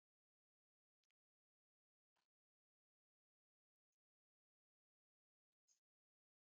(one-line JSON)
{"exhalation_length": "6.6 s", "exhalation_amplitude": 18, "exhalation_signal_mean_std_ratio": 0.1, "survey_phase": "beta (2021-08-13 to 2022-03-07)", "age": "65+", "gender": "Female", "wearing_mask": "No", "symptom_none": true, "smoker_status": "Ex-smoker", "respiratory_condition_asthma": false, "respiratory_condition_other": false, "recruitment_source": "REACT", "submission_delay": "2 days", "covid_test_result": "Negative", "covid_test_method": "RT-qPCR", "influenza_a_test_result": "Negative", "influenza_b_test_result": "Negative"}